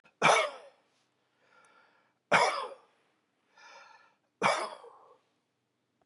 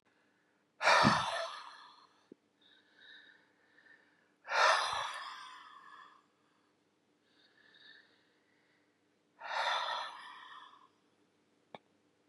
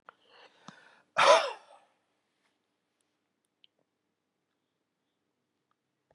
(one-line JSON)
{"three_cough_length": "6.1 s", "three_cough_amplitude": 11419, "three_cough_signal_mean_std_ratio": 0.3, "exhalation_length": "12.3 s", "exhalation_amplitude": 7695, "exhalation_signal_mean_std_ratio": 0.33, "cough_length": "6.1 s", "cough_amplitude": 13660, "cough_signal_mean_std_ratio": 0.18, "survey_phase": "beta (2021-08-13 to 2022-03-07)", "age": "65+", "gender": "Male", "wearing_mask": "No", "symptom_none": true, "smoker_status": "Ex-smoker", "respiratory_condition_asthma": false, "respiratory_condition_other": false, "recruitment_source": "REACT", "submission_delay": "15 days", "covid_test_result": "Negative", "covid_test_method": "RT-qPCR", "influenza_a_test_result": "Negative", "influenza_b_test_result": "Negative"}